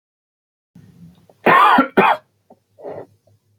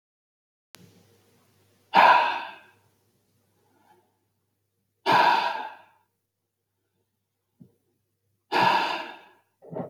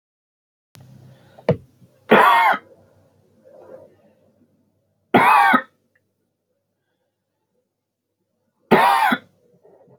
cough_length: 3.6 s
cough_amplitude: 27888
cough_signal_mean_std_ratio: 0.36
exhalation_length: 9.9 s
exhalation_amplitude: 19928
exhalation_signal_mean_std_ratio: 0.31
three_cough_length: 10.0 s
three_cough_amplitude: 30145
three_cough_signal_mean_std_ratio: 0.32
survey_phase: beta (2021-08-13 to 2022-03-07)
age: 18-44
gender: Male
wearing_mask: 'No'
symptom_runny_or_blocked_nose: true
smoker_status: Never smoked
respiratory_condition_asthma: false
respiratory_condition_other: false
recruitment_source: REACT
submission_delay: 2 days
covid_test_result: Negative
covid_test_method: RT-qPCR
influenza_a_test_result: Negative
influenza_b_test_result: Negative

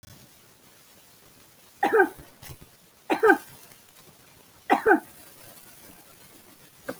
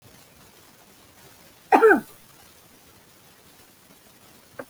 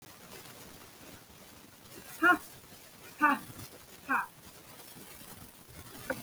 three_cough_length: 7.0 s
three_cough_amplitude: 22918
three_cough_signal_mean_std_ratio: 0.3
cough_length: 4.7 s
cough_amplitude: 29486
cough_signal_mean_std_ratio: 0.23
exhalation_length: 6.2 s
exhalation_amplitude: 8691
exhalation_signal_mean_std_ratio: 0.36
survey_phase: beta (2021-08-13 to 2022-03-07)
age: 45-64
gender: Female
wearing_mask: 'No'
symptom_sore_throat: true
symptom_onset: 11 days
smoker_status: Never smoked
respiratory_condition_asthma: false
respiratory_condition_other: false
recruitment_source: REACT
submission_delay: 3 days
covid_test_result: Negative
covid_test_method: RT-qPCR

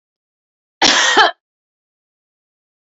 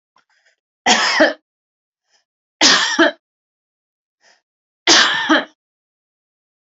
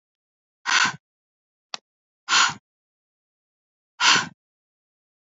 cough_length: 2.9 s
cough_amplitude: 31738
cough_signal_mean_std_ratio: 0.33
three_cough_length: 6.7 s
three_cough_amplitude: 32767
three_cough_signal_mean_std_ratio: 0.37
exhalation_length: 5.2 s
exhalation_amplitude: 22536
exhalation_signal_mean_std_ratio: 0.29
survey_phase: alpha (2021-03-01 to 2021-08-12)
age: 45-64
gender: Female
wearing_mask: 'No'
symptom_none: true
smoker_status: Never smoked
respiratory_condition_asthma: false
respiratory_condition_other: false
recruitment_source: REACT
submission_delay: 2 days
covid_test_result: Negative
covid_test_method: RT-qPCR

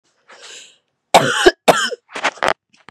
cough_length: 2.9 s
cough_amplitude: 32768
cough_signal_mean_std_ratio: 0.37
survey_phase: beta (2021-08-13 to 2022-03-07)
age: 18-44
gender: Female
wearing_mask: 'No'
symptom_cough_any: true
symptom_new_continuous_cough: true
symptom_runny_or_blocked_nose: true
symptom_shortness_of_breath: true
symptom_sore_throat: true
symptom_fatigue: true
symptom_headache: true
symptom_change_to_sense_of_smell_or_taste: true
symptom_other: true
symptom_onset: 3 days
smoker_status: Never smoked
respiratory_condition_asthma: false
respiratory_condition_other: false
recruitment_source: Test and Trace
submission_delay: 1 day
covid_test_result: Positive
covid_test_method: ePCR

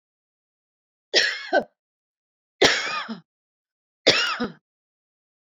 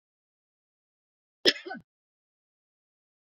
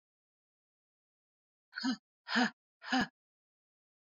three_cough_length: 5.5 s
three_cough_amplitude: 29863
three_cough_signal_mean_std_ratio: 0.34
cough_length: 3.3 s
cough_amplitude: 20773
cough_signal_mean_std_ratio: 0.14
exhalation_length: 4.1 s
exhalation_amplitude: 4649
exhalation_signal_mean_std_ratio: 0.29
survey_phase: beta (2021-08-13 to 2022-03-07)
age: 65+
gender: Female
wearing_mask: 'No'
symptom_none: true
smoker_status: Never smoked
respiratory_condition_asthma: false
respiratory_condition_other: false
recruitment_source: REACT
submission_delay: 5 days
covid_test_result: Negative
covid_test_method: RT-qPCR
influenza_a_test_result: Negative
influenza_b_test_result: Negative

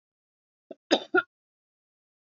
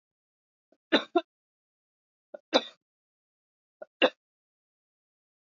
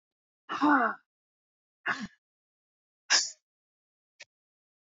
cough_length: 2.3 s
cough_amplitude: 14729
cough_signal_mean_std_ratio: 0.2
three_cough_length: 5.5 s
three_cough_amplitude: 15263
three_cough_signal_mean_std_ratio: 0.17
exhalation_length: 4.9 s
exhalation_amplitude: 9891
exhalation_signal_mean_std_ratio: 0.29
survey_phase: beta (2021-08-13 to 2022-03-07)
age: 45-64
gender: Female
wearing_mask: 'No'
symptom_none: true
smoker_status: Never smoked
respiratory_condition_asthma: false
respiratory_condition_other: true
recruitment_source: Test and Trace
submission_delay: 0 days
covid_test_result: Negative
covid_test_method: LFT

